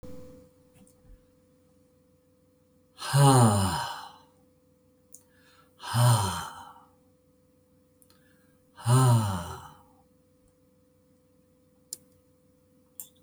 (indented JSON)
{
  "exhalation_length": "13.2 s",
  "exhalation_amplitude": 14814,
  "exhalation_signal_mean_std_ratio": 0.33,
  "survey_phase": "beta (2021-08-13 to 2022-03-07)",
  "age": "65+",
  "gender": "Male",
  "wearing_mask": "No",
  "symptom_none": true,
  "smoker_status": "Never smoked",
  "respiratory_condition_asthma": false,
  "respiratory_condition_other": false,
  "recruitment_source": "REACT",
  "submission_delay": "2 days",
  "covid_test_result": "Negative",
  "covid_test_method": "RT-qPCR"
}